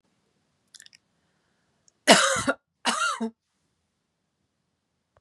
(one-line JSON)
{"cough_length": "5.2 s", "cough_amplitude": 32467, "cough_signal_mean_std_ratio": 0.27, "survey_phase": "beta (2021-08-13 to 2022-03-07)", "age": "45-64", "gender": "Female", "wearing_mask": "No", "symptom_none": true, "smoker_status": "Ex-smoker", "respiratory_condition_asthma": false, "respiratory_condition_other": false, "recruitment_source": "REACT", "submission_delay": "1 day", "covid_test_result": "Negative", "covid_test_method": "RT-qPCR", "influenza_a_test_result": "Negative", "influenza_b_test_result": "Negative"}